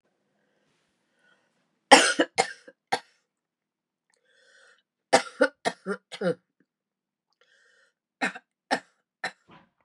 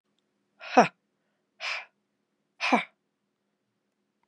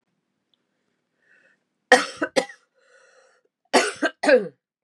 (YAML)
three_cough_length: 9.8 s
three_cough_amplitude: 32755
three_cough_signal_mean_std_ratio: 0.22
exhalation_length: 4.3 s
exhalation_amplitude: 21041
exhalation_signal_mean_std_ratio: 0.22
cough_length: 4.8 s
cough_amplitude: 32768
cough_signal_mean_std_ratio: 0.28
survey_phase: beta (2021-08-13 to 2022-03-07)
age: 65+
gender: Female
wearing_mask: 'No'
symptom_new_continuous_cough: true
symptom_runny_or_blocked_nose: true
symptom_onset: 3 days
smoker_status: Never smoked
respiratory_condition_asthma: false
respiratory_condition_other: false
recruitment_source: Test and Trace
submission_delay: 1 day
covid_test_result: Positive
covid_test_method: RT-qPCR
covid_ct_value: 23.2
covid_ct_gene: N gene